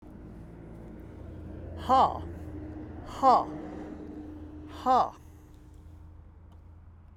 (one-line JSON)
{"exhalation_length": "7.2 s", "exhalation_amplitude": 11005, "exhalation_signal_mean_std_ratio": 0.43, "survey_phase": "beta (2021-08-13 to 2022-03-07)", "age": "65+", "gender": "Male", "wearing_mask": "No", "symptom_none": true, "smoker_status": "Never smoked", "respiratory_condition_asthma": false, "respiratory_condition_other": false, "recruitment_source": "REACT", "submission_delay": "1 day", "covid_test_result": "Negative", "covid_test_method": "RT-qPCR"}